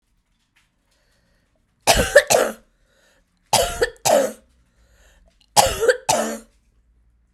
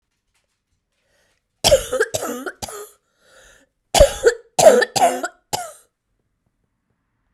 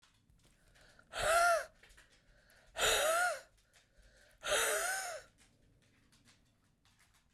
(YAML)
three_cough_length: 7.3 s
three_cough_amplitude: 32768
three_cough_signal_mean_std_ratio: 0.36
cough_length: 7.3 s
cough_amplitude: 32768
cough_signal_mean_std_ratio: 0.33
exhalation_length: 7.3 s
exhalation_amplitude: 3857
exhalation_signal_mean_std_ratio: 0.43
survey_phase: beta (2021-08-13 to 2022-03-07)
age: 45-64
gender: Female
wearing_mask: 'No'
symptom_sore_throat: true
smoker_status: Never smoked
respiratory_condition_asthma: false
respiratory_condition_other: false
recruitment_source: REACT
submission_delay: 0 days
covid_test_result: Negative
covid_test_method: RT-qPCR